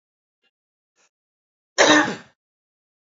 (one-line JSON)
{"cough_length": "3.1 s", "cough_amplitude": 26965, "cough_signal_mean_std_ratio": 0.26, "survey_phase": "beta (2021-08-13 to 2022-03-07)", "age": "45-64", "gender": "Male", "wearing_mask": "No", "symptom_cough_any": true, "symptom_runny_or_blocked_nose": true, "symptom_fatigue": true, "symptom_fever_high_temperature": true, "symptom_headache": true, "symptom_change_to_sense_of_smell_or_taste": true, "symptom_loss_of_taste": true, "symptom_onset": "2 days", "smoker_status": "Never smoked", "respiratory_condition_asthma": false, "respiratory_condition_other": false, "recruitment_source": "Test and Trace", "submission_delay": "1 day", "covid_test_result": "Positive", "covid_test_method": "RT-qPCR"}